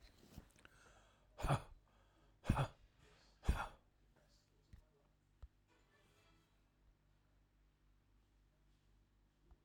{
  "exhalation_length": "9.6 s",
  "exhalation_amplitude": 3313,
  "exhalation_signal_mean_std_ratio": 0.24,
  "survey_phase": "alpha (2021-03-01 to 2021-08-12)",
  "age": "65+",
  "gender": "Male",
  "wearing_mask": "No",
  "symptom_none": true,
  "smoker_status": "Never smoked",
  "respiratory_condition_asthma": false,
  "respiratory_condition_other": true,
  "recruitment_source": "REACT",
  "submission_delay": "2 days",
  "covid_test_result": "Negative",
  "covid_test_method": "RT-qPCR"
}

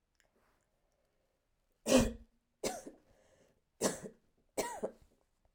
{
  "three_cough_length": "5.5 s",
  "three_cough_amplitude": 7898,
  "three_cough_signal_mean_std_ratio": 0.28,
  "survey_phase": "beta (2021-08-13 to 2022-03-07)",
  "age": "45-64",
  "gender": "Female",
  "wearing_mask": "No",
  "symptom_cough_any": true,
  "symptom_sore_throat": true,
  "symptom_fatigue": true,
  "symptom_onset": "3 days",
  "smoker_status": "Never smoked",
  "respiratory_condition_asthma": false,
  "respiratory_condition_other": false,
  "recruitment_source": "Test and Trace",
  "submission_delay": "1 day",
  "covid_test_result": "Positive",
  "covid_test_method": "ePCR"
}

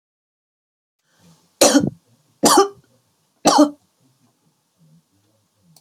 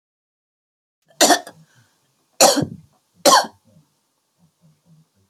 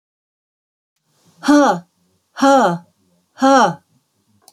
{
  "three_cough_length": "5.8 s",
  "three_cough_amplitude": 32768,
  "three_cough_signal_mean_std_ratio": 0.28,
  "cough_length": "5.3 s",
  "cough_amplitude": 32768,
  "cough_signal_mean_std_ratio": 0.27,
  "exhalation_length": "4.5 s",
  "exhalation_amplitude": 29479,
  "exhalation_signal_mean_std_ratio": 0.39,
  "survey_phase": "beta (2021-08-13 to 2022-03-07)",
  "age": "65+",
  "gender": "Female",
  "wearing_mask": "No",
  "symptom_cough_any": true,
  "symptom_diarrhoea": true,
  "smoker_status": "Never smoked",
  "respiratory_condition_asthma": false,
  "respiratory_condition_other": false,
  "recruitment_source": "REACT",
  "submission_delay": "4 days",
  "covid_test_result": "Negative",
  "covid_test_method": "RT-qPCR"
}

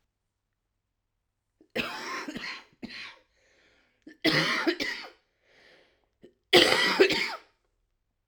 {
  "cough_length": "8.3 s",
  "cough_amplitude": 18257,
  "cough_signal_mean_std_ratio": 0.36,
  "survey_phase": "alpha (2021-03-01 to 2021-08-12)",
  "age": "45-64",
  "gender": "Female",
  "wearing_mask": "No",
  "symptom_cough_any": true,
  "symptom_shortness_of_breath": true,
  "symptom_abdominal_pain": true,
  "symptom_diarrhoea": true,
  "symptom_fatigue": true,
  "symptom_fever_high_temperature": true,
  "symptom_headache": true,
  "symptom_change_to_sense_of_smell_or_taste": true,
  "symptom_loss_of_taste": true,
  "symptom_onset": "3 days",
  "smoker_status": "Current smoker (e-cigarettes or vapes only)",
  "respiratory_condition_asthma": false,
  "respiratory_condition_other": false,
  "recruitment_source": "Test and Trace",
  "submission_delay": "2 days",
  "covid_test_result": "Positive",
  "covid_test_method": "RT-qPCR",
  "covid_ct_value": 17.4,
  "covid_ct_gene": "ORF1ab gene",
  "covid_ct_mean": 17.6,
  "covid_viral_load": "1700000 copies/ml",
  "covid_viral_load_category": "High viral load (>1M copies/ml)"
}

